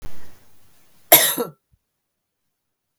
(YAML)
cough_length: 3.0 s
cough_amplitude: 32766
cough_signal_mean_std_ratio: 0.32
survey_phase: beta (2021-08-13 to 2022-03-07)
age: 45-64
gender: Female
wearing_mask: 'No'
symptom_cough_any: true
symptom_runny_or_blocked_nose: true
symptom_fatigue: true
symptom_headache: true
smoker_status: Never smoked
respiratory_condition_asthma: false
respiratory_condition_other: false
recruitment_source: REACT
submission_delay: 1 day
covid_test_result: Negative
covid_test_method: RT-qPCR
influenza_a_test_result: Negative
influenza_b_test_result: Negative